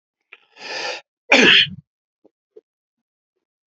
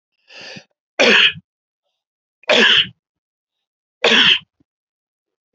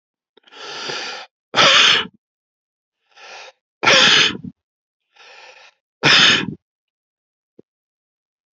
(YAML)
cough_length: 3.7 s
cough_amplitude: 32076
cough_signal_mean_std_ratio: 0.3
three_cough_length: 5.5 s
three_cough_amplitude: 30507
three_cough_signal_mean_std_ratio: 0.37
exhalation_length: 8.5 s
exhalation_amplitude: 32768
exhalation_signal_mean_std_ratio: 0.36
survey_phase: beta (2021-08-13 to 2022-03-07)
age: 45-64
gender: Male
wearing_mask: 'No'
symptom_none: true
smoker_status: Ex-smoker
respiratory_condition_asthma: false
respiratory_condition_other: false
recruitment_source: REACT
submission_delay: 1 day
covid_test_result: Negative
covid_test_method: RT-qPCR